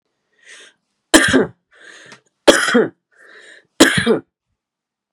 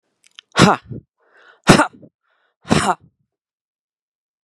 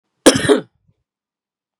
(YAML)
three_cough_length: 5.1 s
three_cough_amplitude: 32768
three_cough_signal_mean_std_ratio: 0.35
exhalation_length: 4.4 s
exhalation_amplitude: 32768
exhalation_signal_mean_std_ratio: 0.27
cough_length: 1.8 s
cough_amplitude: 32768
cough_signal_mean_std_ratio: 0.29
survey_phase: beta (2021-08-13 to 2022-03-07)
age: 18-44
gender: Male
wearing_mask: 'No'
symptom_runny_or_blocked_nose: true
symptom_fatigue: true
symptom_onset: 12 days
smoker_status: Never smoked
respiratory_condition_asthma: true
respiratory_condition_other: false
recruitment_source: REACT
submission_delay: 2 days
covid_test_result: Negative
covid_test_method: RT-qPCR
influenza_a_test_result: Negative
influenza_b_test_result: Negative